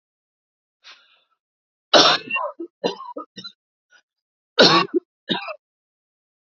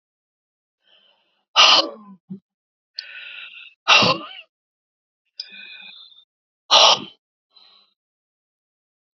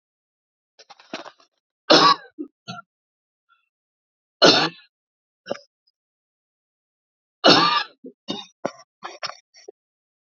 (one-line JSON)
{"cough_length": "6.6 s", "cough_amplitude": 31887, "cough_signal_mean_std_ratio": 0.3, "exhalation_length": "9.1 s", "exhalation_amplitude": 32767, "exhalation_signal_mean_std_ratio": 0.27, "three_cough_length": "10.2 s", "three_cough_amplitude": 31403, "three_cough_signal_mean_std_ratio": 0.26, "survey_phase": "beta (2021-08-13 to 2022-03-07)", "age": "45-64", "gender": "Female", "wearing_mask": "No", "symptom_cough_any": true, "smoker_status": "Ex-smoker", "respiratory_condition_asthma": false, "respiratory_condition_other": false, "recruitment_source": "REACT", "submission_delay": "3 days", "covid_test_result": "Negative", "covid_test_method": "RT-qPCR", "influenza_a_test_result": "Negative", "influenza_b_test_result": "Negative"}